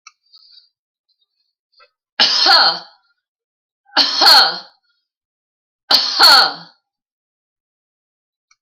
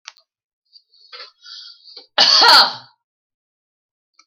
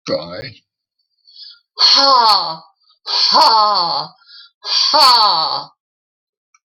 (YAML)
three_cough_length: 8.6 s
three_cough_amplitude: 32768
three_cough_signal_mean_std_ratio: 0.35
cough_length: 4.3 s
cough_amplitude: 32768
cough_signal_mean_std_ratio: 0.3
exhalation_length: 6.7 s
exhalation_amplitude: 32767
exhalation_signal_mean_std_ratio: 0.56
survey_phase: alpha (2021-03-01 to 2021-08-12)
age: 65+
gender: Female
wearing_mask: 'No'
symptom_none: true
smoker_status: Never smoked
respiratory_condition_asthma: false
respiratory_condition_other: false
recruitment_source: REACT
submission_delay: 3 days
covid_test_result: Negative
covid_test_method: RT-qPCR